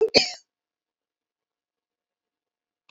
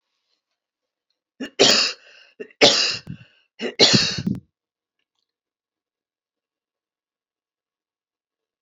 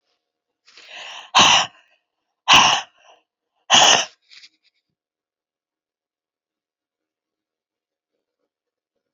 {"cough_length": "2.9 s", "cough_amplitude": 26877, "cough_signal_mean_std_ratio": 0.2, "three_cough_length": "8.6 s", "three_cough_amplitude": 32767, "three_cough_signal_mean_std_ratio": 0.29, "exhalation_length": "9.1 s", "exhalation_amplitude": 32767, "exhalation_signal_mean_std_ratio": 0.26, "survey_phase": "beta (2021-08-13 to 2022-03-07)", "age": "65+", "gender": "Female", "wearing_mask": "No", "symptom_cough_any": true, "symptom_loss_of_taste": true, "smoker_status": "Never smoked", "respiratory_condition_asthma": false, "respiratory_condition_other": true, "recruitment_source": "REACT", "submission_delay": "2 days", "covid_test_result": "Negative", "covid_test_method": "RT-qPCR"}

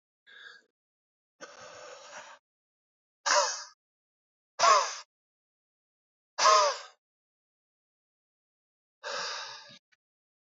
{"exhalation_length": "10.5 s", "exhalation_amplitude": 11197, "exhalation_signal_mean_std_ratio": 0.28, "survey_phase": "beta (2021-08-13 to 2022-03-07)", "age": "18-44", "gender": "Male", "wearing_mask": "No", "symptom_cough_any": true, "symptom_fever_high_temperature": true, "symptom_headache": true, "symptom_change_to_sense_of_smell_or_taste": true, "symptom_onset": "2 days", "smoker_status": "Never smoked", "respiratory_condition_asthma": false, "respiratory_condition_other": false, "recruitment_source": "Test and Trace", "submission_delay": "1 day", "covid_test_result": "Positive", "covid_test_method": "RT-qPCR"}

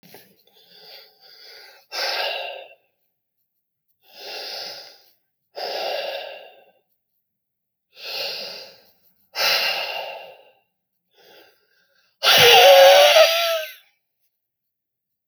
{"exhalation_length": "15.3 s", "exhalation_amplitude": 29920, "exhalation_signal_mean_std_ratio": 0.34, "survey_phase": "alpha (2021-03-01 to 2021-08-12)", "age": "65+", "gender": "Male", "wearing_mask": "No", "symptom_cough_any": true, "smoker_status": "Never smoked", "respiratory_condition_asthma": false, "respiratory_condition_other": true, "recruitment_source": "REACT", "submission_delay": "3 days", "covid_test_result": "Negative", "covid_test_method": "RT-qPCR"}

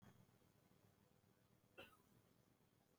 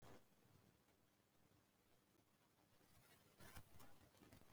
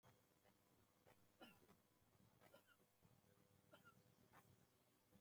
{"cough_length": "3.0 s", "cough_amplitude": 167, "cough_signal_mean_std_ratio": 0.68, "exhalation_length": "4.5 s", "exhalation_amplitude": 208, "exhalation_signal_mean_std_ratio": 0.69, "three_cough_length": "5.2 s", "three_cough_amplitude": 101, "three_cough_signal_mean_std_ratio": 0.81, "survey_phase": "beta (2021-08-13 to 2022-03-07)", "age": "65+", "gender": "Male", "wearing_mask": "No", "symptom_none": true, "smoker_status": "Ex-smoker", "respiratory_condition_asthma": false, "respiratory_condition_other": false, "recruitment_source": "REACT", "submission_delay": "5 days", "covid_test_result": "Negative", "covid_test_method": "RT-qPCR"}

